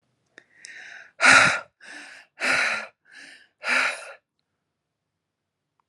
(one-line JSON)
{"exhalation_length": "5.9 s", "exhalation_amplitude": 26591, "exhalation_signal_mean_std_ratio": 0.34, "survey_phase": "alpha (2021-03-01 to 2021-08-12)", "age": "18-44", "gender": "Female", "wearing_mask": "No", "symptom_none": true, "smoker_status": "Ex-smoker", "respiratory_condition_asthma": false, "respiratory_condition_other": false, "recruitment_source": "REACT", "submission_delay": "1 day", "covid_test_result": "Negative", "covid_test_method": "RT-qPCR"}